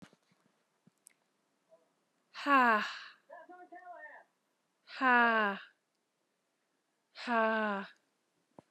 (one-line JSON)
{"exhalation_length": "8.7 s", "exhalation_amplitude": 7301, "exhalation_signal_mean_std_ratio": 0.34, "survey_phase": "beta (2021-08-13 to 2022-03-07)", "age": "45-64", "gender": "Female", "wearing_mask": "No", "symptom_runny_or_blocked_nose": true, "symptom_fatigue": true, "smoker_status": "Never smoked", "respiratory_condition_asthma": false, "respiratory_condition_other": false, "recruitment_source": "REACT", "submission_delay": "1 day", "covid_test_result": "Negative", "covid_test_method": "RT-qPCR", "influenza_a_test_result": "Negative", "influenza_b_test_result": "Negative"}